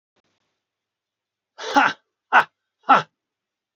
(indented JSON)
{
  "exhalation_length": "3.8 s",
  "exhalation_amplitude": 28018,
  "exhalation_signal_mean_std_ratio": 0.25,
  "survey_phase": "beta (2021-08-13 to 2022-03-07)",
  "age": "45-64",
  "gender": "Male",
  "wearing_mask": "No",
  "symptom_cough_any": true,
  "symptom_runny_or_blocked_nose": true,
  "symptom_fatigue": true,
  "smoker_status": "Ex-smoker",
  "respiratory_condition_asthma": false,
  "respiratory_condition_other": false,
  "recruitment_source": "Test and Trace",
  "submission_delay": "1 day",
  "covid_test_result": "Positive",
  "covid_test_method": "RT-qPCR",
  "covid_ct_value": 28.6,
  "covid_ct_gene": "N gene"
}